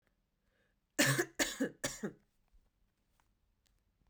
{
  "three_cough_length": "4.1 s",
  "three_cough_amplitude": 4931,
  "three_cough_signal_mean_std_ratio": 0.31,
  "survey_phase": "beta (2021-08-13 to 2022-03-07)",
  "age": "18-44",
  "gender": "Female",
  "wearing_mask": "No",
  "symptom_cough_any": true,
  "symptom_runny_or_blocked_nose": true,
  "symptom_shortness_of_breath": true,
  "symptom_sore_throat": true,
  "symptom_fatigue": true,
  "symptom_headache": true,
  "symptom_change_to_sense_of_smell_or_taste": true,
  "smoker_status": "Ex-smoker",
  "respiratory_condition_asthma": false,
  "respiratory_condition_other": false,
  "recruitment_source": "Test and Trace",
  "submission_delay": "0 days",
  "covid_test_result": "Positive",
  "covid_test_method": "LFT"
}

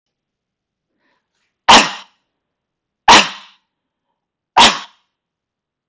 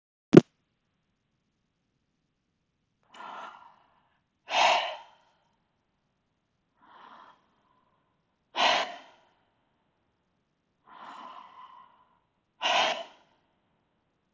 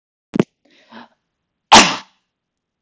{
  "three_cough_length": "5.9 s",
  "three_cough_amplitude": 32768,
  "three_cough_signal_mean_std_ratio": 0.26,
  "exhalation_length": "14.3 s",
  "exhalation_amplitude": 28503,
  "exhalation_signal_mean_std_ratio": 0.2,
  "cough_length": "2.8 s",
  "cough_amplitude": 32768,
  "cough_signal_mean_std_ratio": 0.24,
  "survey_phase": "beta (2021-08-13 to 2022-03-07)",
  "age": "18-44",
  "gender": "Male",
  "wearing_mask": "Yes",
  "symptom_none": true,
  "smoker_status": "Never smoked",
  "respiratory_condition_asthma": false,
  "respiratory_condition_other": false,
  "recruitment_source": "REACT",
  "submission_delay": "3 days",
  "covid_test_result": "Negative",
  "covid_test_method": "RT-qPCR"
}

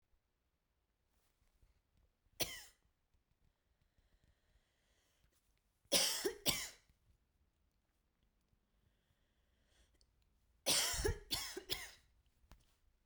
{
  "three_cough_length": "13.1 s",
  "three_cough_amplitude": 3466,
  "three_cough_signal_mean_std_ratio": 0.28,
  "survey_phase": "beta (2021-08-13 to 2022-03-07)",
  "age": "18-44",
  "gender": "Female",
  "wearing_mask": "No",
  "symptom_cough_any": true,
  "symptom_runny_or_blocked_nose": true,
  "symptom_shortness_of_breath": true,
  "symptom_fatigue": true,
  "symptom_headache": true,
  "symptom_change_to_sense_of_smell_or_taste": true,
  "symptom_loss_of_taste": true,
  "symptom_other": true,
  "symptom_onset": "3 days",
  "smoker_status": "Never smoked",
  "respiratory_condition_asthma": true,
  "respiratory_condition_other": false,
  "recruitment_source": "Test and Trace",
  "submission_delay": "2 days",
  "covid_test_result": "Positive",
  "covid_test_method": "RT-qPCR",
  "covid_ct_value": 18.8,
  "covid_ct_gene": "ORF1ab gene",
  "covid_ct_mean": 19.4,
  "covid_viral_load": "430000 copies/ml",
  "covid_viral_load_category": "Low viral load (10K-1M copies/ml)"
}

